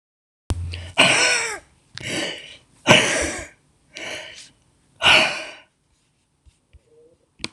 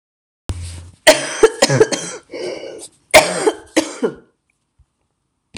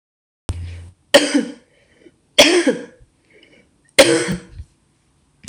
{"exhalation_length": "7.5 s", "exhalation_amplitude": 26028, "exhalation_signal_mean_std_ratio": 0.4, "cough_length": "5.6 s", "cough_amplitude": 26028, "cough_signal_mean_std_ratio": 0.38, "three_cough_length": "5.5 s", "three_cough_amplitude": 26028, "three_cough_signal_mean_std_ratio": 0.35, "survey_phase": "beta (2021-08-13 to 2022-03-07)", "age": "65+", "gender": "Female", "wearing_mask": "No", "symptom_cough_any": true, "symptom_runny_or_blocked_nose": true, "symptom_fatigue": true, "symptom_fever_high_temperature": true, "symptom_onset": "2 days", "smoker_status": "Never smoked", "respiratory_condition_asthma": false, "respiratory_condition_other": false, "recruitment_source": "Test and Trace", "submission_delay": "1 day", "covid_test_result": "Positive", "covid_test_method": "RT-qPCR", "covid_ct_value": 22.7, "covid_ct_gene": "ORF1ab gene", "covid_ct_mean": 23.1, "covid_viral_load": "27000 copies/ml", "covid_viral_load_category": "Low viral load (10K-1M copies/ml)"}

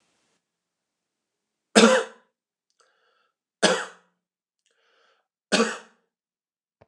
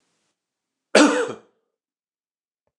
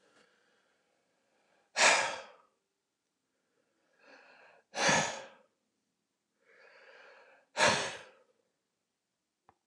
{"three_cough_length": "6.9 s", "three_cough_amplitude": 29103, "three_cough_signal_mean_std_ratio": 0.23, "cough_length": "2.8 s", "cough_amplitude": 29169, "cough_signal_mean_std_ratio": 0.26, "exhalation_length": "9.7 s", "exhalation_amplitude": 9271, "exhalation_signal_mean_std_ratio": 0.27, "survey_phase": "beta (2021-08-13 to 2022-03-07)", "age": "65+", "gender": "Male", "wearing_mask": "No", "symptom_none": true, "smoker_status": "Ex-smoker", "respiratory_condition_asthma": false, "respiratory_condition_other": false, "recruitment_source": "REACT", "submission_delay": "2 days", "covid_test_result": "Negative", "covid_test_method": "RT-qPCR"}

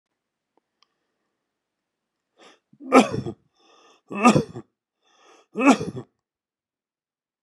{"three_cough_length": "7.4 s", "three_cough_amplitude": 26197, "three_cough_signal_mean_std_ratio": 0.24, "survey_phase": "beta (2021-08-13 to 2022-03-07)", "age": "45-64", "gender": "Male", "wearing_mask": "No", "symptom_none": true, "smoker_status": "Ex-smoker", "respiratory_condition_asthma": false, "respiratory_condition_other": false, "recruitment_source": "REACT", "submission_delay": "1 day", "covid_test_result": "Negative", "covid_test_method": "RT-qPCR", "influenza_a_test_result": "Negative", "influenza_b_test_result": "Negative"}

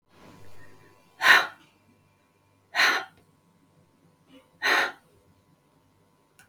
{"exhalation_length": "6.5 s", "exhalation_amplitude": 20000, "exhalation_signal_mean_std_ratio": 0.29, "survey_phase": "beta (2021-08-13 to 2022-03-07)", "age": "65+", "gender": "Female", "wearing_mask": "No", "symptom_none": true, "smoker_status": "Ex-smoker", "respiratory_condition_asthma": false, "respiratory_condition_other": false, "recruitment_source": "REACT", "submission_delay": "2 days", "covid_test_result": "Negative", "covid_test_method": "RT-qPCR", "influenza_a_test_result": "Unknown/Void", "influenza_b_test_result": "Unknown/Void"}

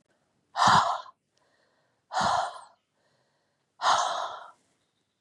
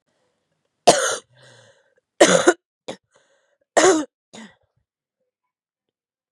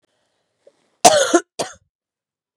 {"exhalation_length": "5.2 s", "exhalation_amplitude": 12758, "exhalation_signal_mean_std_ratio": 0.39, "three_cough_length": "6.3 s", "three_cough_amplitude": 32768, "three_cough_signal_mean_std_ratio": 0.27, "cough_length": "2.6 s", "cough_amplitude": 32768, "cough_signal_mean_std_ratio": 0.28, "survey_phase": "beta (2021-08-13 to 2022-03-07)", "age": "45-64", "gender": "Female", "wearing_mask": "No", "symptom_cough_any": true, "symptom_new_continuous_cough": true, "symptom_runny_or_blocked_nose": true, "symptom_sore_throat": true, "symptom_fatigue": true, "symptom_headache": true, "symptom_onset": "3 days", "smoker_status": "Never smoked", "respiratory_condition_asthma": false, "respiratory_condition_other": false, "recruitment_source": "Test and Trace", "submission_delay": "1 day", "covid_test_result": "Positive", "covid_test_method": "RT-qPCR"}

